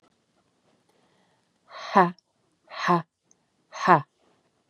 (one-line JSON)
{"exhalation_length": "4.7 s", "exhalation_amplitude": 27287, "exhalation_signal_mean_std_ratio": 0.25, "survey_phase": "beta (2021-08-13 to 2022-03-07)", "age": "45-64", "gender": "Female", "wearing_mask": "No", "symptom_cough_any": true, "symptom_runny_or_blocked_nose": true, "symptom_sore_throat": true, "symptom_fatigue": true, "symptom_fever_high_temperature": true, "symptom_headache": true, "symptom_change_to_sense_of_smell_or_taste": true, "symptom_loss_of_taste": true, "symptom_onset": "5 days", "smoker_status": "Never smoked", "respiratory_condition_asthma": false, "respiratory_condition_other": false, "recruitment_source": "Test and Trace", "submission_delay": "1 day", "covid_test_result": "Positive", "covid_test_method": "RT-qPCR"}